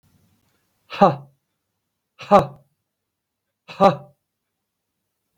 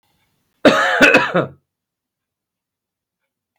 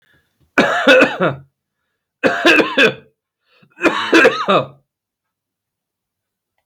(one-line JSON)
{"exhalation_length": "5.4 s", "exhalation_amplitude": 32768, "exhalation_signal_mean_std_ratio": 0.22, "cough_length": "3.6 s", "cough_amplitude": 32768, "cough_signal_mean_std_ratio": 0.35, "three_cough_length": "6.7 s", "three_cough_amplitude": 32768, "three_cough_signal_mean_std_ratio": 0.44, "survey_phase": "beta (2021-08-13 to 2022-03-07)", "age": "18-44", "gender": "Male", "wearing_mask": "No", "symptom_cough_any": true, "symptom_runny_or_blocked_nose": true, "symptom_diarrhoea": true, "symptom_fatigue": true, "symptom_headache": true, "symptom_change_to_sense_of_smell_or_taste": true, "symptom_loss_of_taste": true, "symptom_onset": "5 days", "smoker_status": "Ex-smoker", "respiratory_condition_asthma": false, "respiratory_condition_other": true, "recruitment_source": "Test and Trace", "submission_delay": "2 days", "covid_test_result": "Positive", "covid_test_method": "RT-qPCR", "covid_ct_value": 21.3, "covid_ct_gene": "ORF1ab gene", "covid_ct_mean": 22.3, "covid_viral_load": "49000 copies/ml", "covid_viral_load_category": "Low viral load (10K-1M copies/ml)"}